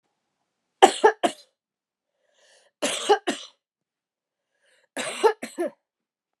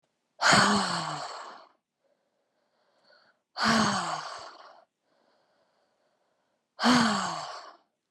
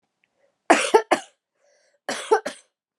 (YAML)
three_cough_length: 6.4 s
three_cough_amplitude: 32450
three_cough_signal_mean_std_ratio: 0.26
exhalation_length: 8.1 s
exhalation_amplitude: 13218
exhalation_signal_mean_std_ratio: 0.41
cough_length: 3.0 s
cough_amplitude: 30181
cough_signal_mean_std_ratio: 0.3
survey_phase: beta (2021-08-13 to 2022-03-07)
age: 18-44
gender: Female
wearing_mask: 'No'
symptom_cough_any: true
symptom_runny_or_blocked_nose: true
symptom_fatigue: true
symptom_headache: true
symptom_other: true
symptom_onset: 7 days
smoker_status: Never smoked
respiratory_condition_asthma: false
respiratory_condition_other: false
recruitment_source: Test and Trace
submission_delay: 2 days
covid_test_result: Positive
covid_test_method: RT-qPCR
covid_ct_value: 31.6
covid_ct_gene: ORF1ab gene